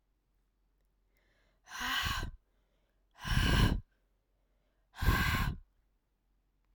{"exhalation_length": "6.7 s", "exhalation_amplitude": 5999, "exhalation_signal_mean_std_ratio": 0.4, "survey_phase": "alpha (2021-03-01 to 2021-08-12)", "age": "18-44", "gender": "Female", "wearing_mask": "No", "symptom_cough_any": true, "symptom_fatigue": true, "symptom_onset": "2 days", "smoker_status": "Never smoked", "respiratory_condition_asthma": false, "respiratory_condition_other": false, "recruitment_source": "Test and Trace", "submission_delay": "1 day", "covid_test_result": "Positive", "covid_test_method": "RT-qPCR", "covid_ct_value": 21.7, "covid_ct_gene": "ORF1ab gene", "covid_ct_mean": 22.3, "covid_viral_load": "48000 copies/ml", "covid_viral_load_category": "Low viral load (10K-1M copies/ml)"}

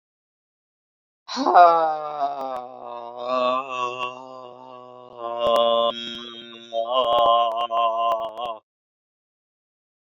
{"exhalation_length": "10.2 s", "exhalation_amplitude": 27245, "exhalation_signal_mean_std_ratio": 0.53, "survey_phase": "beta (2021-08-13 to 2022-03-07)", "age": "45-64", "gender": "Female", "wearing_mask": "No", "symptom_shortness_of_breath": true, "symptom_fatigue": true, "symptom_other": true, "symptom_onset": "13 days", "smoker_status": "Ex-smoker", "respiratory_condition_asthma": false, "respiratory_condition_other": false, "recruitment_source": "REACT", "submission_delay": "2 days", "covid_test_result": "Negative", "covid_test_method": "RT-qPCR", "influenza_a_test_result": "Unknown/Void", "influenza_b_test_result": "Unknown/Void"}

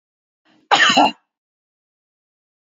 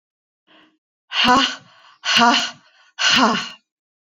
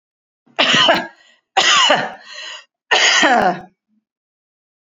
{"cough_length": "2.7 s", "cough_amplitude": 29776, "cough_signal_mean_std_ratio": 0.31, "exhalation_length": "4.1 s", "exhalation_amplitude": 30030, "exhalation_signal_mean_std_ratio": 0.46, "three_cough_length": "4.9 s", "three_cough_amplitude": 32767, "three_cough_signal_mean_std_ratio": 0.52, "survey_phase": "alpha (2021-03-01 to 2021-08-12)", "age": "45-64", "gender": "Female", "wearing_mask": "No", "symptom_none": true, "smoker_status": "Never smoked", "respiratory_condition_asthma": false, "respiratory_condition_other": false, "recruitment_source": "REACT", "submission_delay": "2 days", "covid_test_result": "Negative", "covid_test_method": "RT-qPCR"}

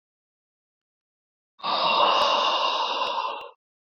{"exhalation_length": "3.9 s", "exhalation_amplitude": 13185, "exhalation_signal_mean_std_ratio": 0.59, "survey_phase": "beta (2021-08-13 to 2022-03-07)", "age": "18-44", "gender": "Male", "wearing_mask": "No", "symptom_cough_any": true, "symptom_runny_or_blocked_nose": true, "symptom_sore_throat": true, "symptom_fatigue": true, "symptom_headache": true, "smoker_status": "Ex-smoker", "respiratory_condition_asthma": false, "respiratory_condition_other": false, "recruitment_source": "Test and Trace", "submission_delay": "1 day", "covid_test_result": "Positive", "covid_test_method": "ePCR"}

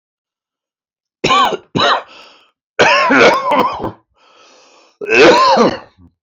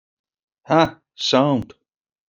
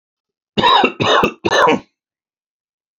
{"three_cough_length": "6.2 s", "three_cough_amplitude": 31788, "three_cough_signal_mean_std_ratio": 0.53, "exhalation_length": "2.3 s", "exhalation_amplitude": 27093, "exhalation_signal_mean_std_ratio": 0.39, "cough_length": "3.0 s", "cough_amplitude": 29162, "cough_signal_mean_std_ratio": 0.48, "survey_phase": "alpha (2021-03-01 to 2021-08-12)", "age": "45-64", "gender": "Male", "wearing_mask": "No", "symptom_cough_any": true, "symptom_headache": true, "symptom_onset": "12 days", "smoker_status": "Never smoked", "respiratory_condition_asthma": true, "respiratory_condition_other": false, "recruitment_source": "REACT", "submission_delay": "1 day", "covid_test_result": "Negative", "covid_test_method": "RT-qPCR"}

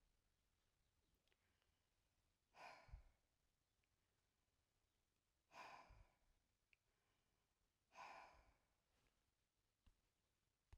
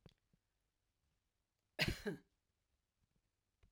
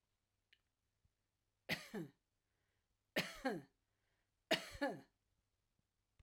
{"exhalation_length": "10.8 s", "exhalation_amplitude": 126, "exhalation_signal_mean_std_ratio": 0.38, "cough_length": "3.7 s", "cough_amplitude": 2242, "cough_signal_mean_std_ratio": 0.21, "three_cough_length": "6.2 s", "three_cough_amplitude": 2625, "three_cough_signal_mean_std_ratio": 0.28, "survey_phase": "alpha (2021-03-01 to 2021-08-12)", "age": "65+", "gender": "Female", "wearing_mask": "No", "symptom_none": true, "smoker_status": "Never smoked", "respiratory_condition_asthma": false, "respiratory_condition_other": false, "recruitment_source": "REACT", "submission_delay": "2 days", "covid_test_result": "Negative", "covid_test_method": "RT-qPCR"}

